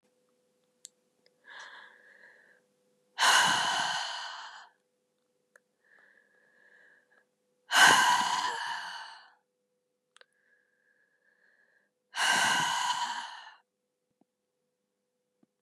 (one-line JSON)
{"exhalation_length": "15.6 s", "exhalation_amplitude": 13570, "exhalation_signal_mean_std_ratio": 0.35, "survey_phase": "beta (2021-08-13 to 2022-03-07)", "age": "45-64", "gender": "Female", "wearing_mask": "No", "symptom_cough_any": true, "symptom_runny_or_blocked_nose": true, "symptom_fatigue": true, "symptom_headache": true, "symptom_onset": "6 days", "smoker_status": "Never smoked", "respiratory_condition_asthma": false, "respiratory_condition_other": false, "recruitment_source": "Test and Trace", "submission_delay": "2 days", "covid_test_result": "Negative", "covid_test_method": "RT-qPCR"}